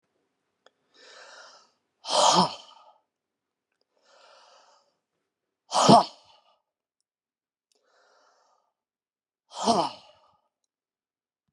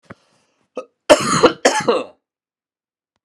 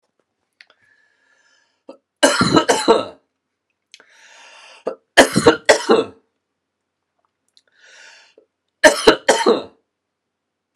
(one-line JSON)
{"exhalation_length": "11.5 s", "exhalation_amplitude": 26978, "exhalation_signal_mean_std_ratio": 0.23, "cough_length": "3.2 s", "cough_amplitude": 32768, "cough_signal_mean_std_ratio": 0.35, "three_cough_length": "10.8 s", "three_cough_amplitude": 32768, "three_cough_signal_mean_std_ratio": 0.31, "survey_phase": "alpha (2021-03-01 to 2021-08-12)", "age": "45-64", "gender": "Male", "wearing_mask": "No", "symptom_cough_any": true, "smoker_status": "Never smoked", "respiratory_condition_asthma": false, "respiratory_condition_other": false, "recruitment_source": "Test and Trace", "submission_delay": "2 days", "covid_test_result": "Positive", "covid_test_method": "RT-qPCR"}